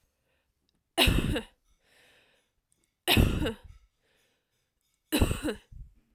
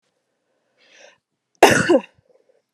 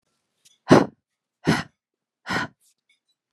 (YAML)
three_cough_length: 6.1 s
three_cough_amplitude: 12707
three_cough_signal_mean_std_ratio: 0.35
cough_length: 2.7 s
cough_amplitude: 32768
cough_signal_mean_std_ratio: 0.27
exhalation_length: 3.3 s
exhalation_amplitude: 32478
exhalation_signal_mean_std_ratio: 0.25
survey_phase: alpha (2021-03-01 to 2021-08-12)
age: 18-44
gender: Female
wearing_mask: 'No'
symptom_none: true
smoker_status: Ex-smoker
respiratory_condition_asthma: false
respiratory_condition_other: false
recruitment_source: REACT
submission_delay: 1 day
covid_test_result: Negative
covid_test_method: RT-qPCR